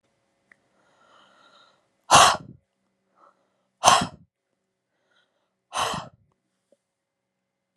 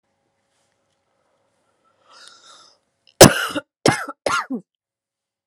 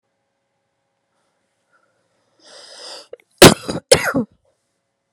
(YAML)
exhalation_length: 7.8 s
exhalation_amplitude: 32768
exhalation_signal_mean_std_ratio: 0.22
three_cough_length: 5.5 s
three_cough_amplitude: 32768
three_cough_signal_mean_std_ratio: 0.21
cough_length: 5.1 s
cough_amplitude: 32768
cough_signal_mean_std_ratio: 0.2
survey_phase: beta (2021-08-13 to 2022-03-07)
age: 18-44
gender: Female
wearing_mask: 'No'
symptom_cough_any: true
symptom_new_continuous_cough: true
symptom_shortness_of_breath: true
symptom_sore_throat: true
symptom_diarrhoea: true
symptom_fatigue: true
symptom_change_to_sense_of_smell_or_taste: true
symptom_loss_of_taste: true
smoker_status: Ex-smoker
respiratory_condition_asthma: false
respiratory_condition_other: false
recruitment_source: Test and Trace
submission_delay: 0 days
covid_test_result: Positive
covid_test_method: LFT